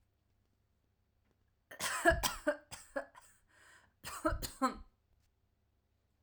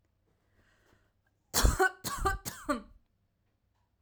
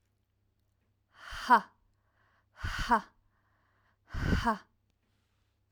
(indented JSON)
{
  "cough_length": "6.2 s",
  "cough_amplitude": 5950,
  "cough_signal_mean_std_ratio": 0.33,
  "three_cough_length": "4.0 s",
  "three_cough_amplitude": 9495,
  "three_cough_signal_mean_std_ratio": 0.34,
  "exhalation_length": "5.7 s",
  "exhalation_amplitude": 10935,
  "exhalation_signal_mean_std_ratio": 0.29,
  "survey_phase": "alpha (2021-03-01 to 2021-08-12)",
  "age": "18-44",
  "gender": "Female",
  "wearing_mask": "No",
  "symptom_none": true,
  "smoker_status": "Never smoked",
  "respiratory_condition_asthma": false,
  "respiratory_condition_other": false,
  "recruitment_source": "REACT",
  "submission_delay": "2 days",
  "covid_test_result": "Negative",
  "covid_test_method": "RT-qPCR"
}